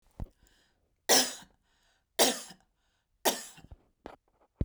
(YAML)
three_cough_length: 4.6 s
three_cough_amplitude: 14295
three_cough_signal_mean_std_ratio: 0.28
survey_phase: beta (2021-08-13 to 2022-03-07)
age: 45-64
gender: Female
wearing_mask: 'No'
symptom_runny_or_blocked_nose: true
symptom_onset: 8 days
smoker_status: Never smoked
respiratory_condition_asthma: false
respiratory_condition_other: false
recruitment_source: REACT
submission_delay: 1 day
covid_test_result: Negative
covid_test_method: RT-qPCR
influenza_a_test_result: Unknown/Void
influenza_b_test_result: Unknown/Void